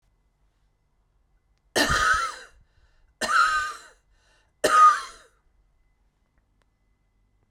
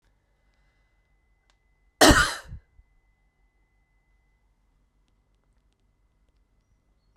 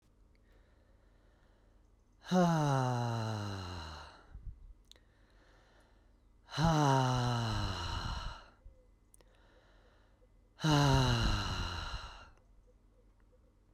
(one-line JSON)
{"three_cough_length": "7.5 s", "three_cough_amplitude": 15181, "three_cough_signal_mean_std_ratio": 0.34, "cough_length": "7.2 s", "cough_amplitude": 26904, "cough_signal_mean_std_ratio": 0.17, "exhalation_length": "13.7 s", "exhalation_amplitude": 5812, "exhalation_signal_mean_std_ratio": 0.48, "survey_phase": "beta (2021-08-13 to 2022-03-07)", "age": "18-44", "gender": "Male", "wearing_mask": "No", "symptom_none": true, "smoker_status": "Never smoked", "respiratory_condition_asthma": false, "respiratory_condition_other": false, "recruitment_source": "Test and Trace", "submission_delay": "2 days", "covid_test_result": "Positive", "covid_test_method": "RT-qPCR", "covid_ct_value": 27.1, "covid_ct_gene": "N gene"}